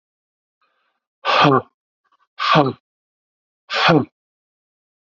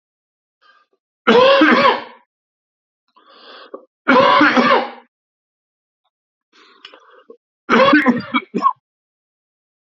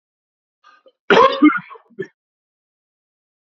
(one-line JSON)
{"exhalation_length": "5.1 s", "exhalation_amplitude": 32768, "exhalation_signal_mean_std_ratio": 0.34, "three_cough_length": "9.9 s", "three_cough_amplitude": 30663, "three_cough_signal_mean_std_ratio": 0.4, "cough_length": "3.4 s", "cough_amplitude": 27836, "cough_signal_mean_std_ratio": 0.28, "survey_phase": "beta (2021-08-13 to 2022-03-07)", "age": "65+", "gender": "Male", "wearing_mask": "No", "symptom_cough_any": true, "symptom_runny_or_blocked_nose": true, "symptom_onset": "12 days", "smoker_status": "Ex-smoker", "respiratory_condition_asthma": false, "respiratory_condition_other": false, "recruitment_source": "REACT", "submission_delay": "1 day", "covid_test_result": "Negative", "covid_test_method": "RT-qPCR", "influenza_a_test_result": "Negative", "influenza_b_test_result": "Negative"}